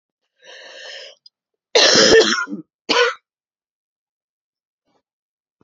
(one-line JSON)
{"cough_length": "5.6 s", "cough_amplitude": 31499, "cough_signal_mean_std_ratio": 0.34, "survey_phase": "alpha (2021-03-01 to 2021-08-12)", "age": "45-64", "gender": "Female", "wearing_mask": "No", "symptom_cough_any": true, "symptom_shortness_of_breath": true, "symptom_abdominal_pain": true, "symptom_fatigue": true, "symptom_fever_high_temperature": true, "symptom_headache": true, "symptom_change_to_sense_of_smell_or_taste": true, "symptom_loss_of_taste": true, "symptom_onset": "5 days", "smoker_status": "Ex-smoker", "respiratory_condition_asthma": false, "respiratory_condition_other": false, "recruitment_source": "Test and Trace", "submission_delay": "2 days", "covid_test_result": "Positive", "covid_test_method": "RT-qPCR", "covid_ct_value": 13.3, "covid_ct_gene": "ORF1ab gene", "covid_ct_mean": 13.9, "covid_viral_load": "28000000 copies/ml", "covid_viral_load_category": "High viral load (>1M copies/ml)"}